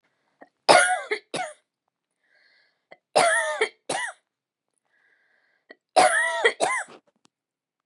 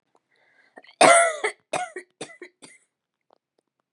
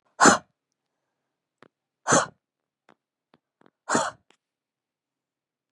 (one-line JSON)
{"three_cough_length": "7.9 s", "three_cough_amplitude": 30079, "three_cough_signal_mean_std_ratio": 0.37, "cough_length": "3.9 s", "cough_amplitude": 27016, "cough_signal_mean_std_ratio": 0.28, "exhalation_length": "5.7 s", "exhalation_amplitude": 26160, "exhalation_signal_mean_std_ratio": 0.22, "survey_phase": "beta (2021-08-13 to 2022-03-07)", "age": "45-64", "gender": "Female", "wearing_mask": "No", "symptom_none": true, "smoker_status": "Never smoked", "respiratory_condition_asthma": false, "respiratory_condition_other": false, "recruitment_source": "REACT", "submission_delay": "1 day", "covid_test_result": "Negative", "covid_test_method": "RT-qPCR", "influenza_a_test_result": "Negative", "influenza_b_test_result": "Negative"}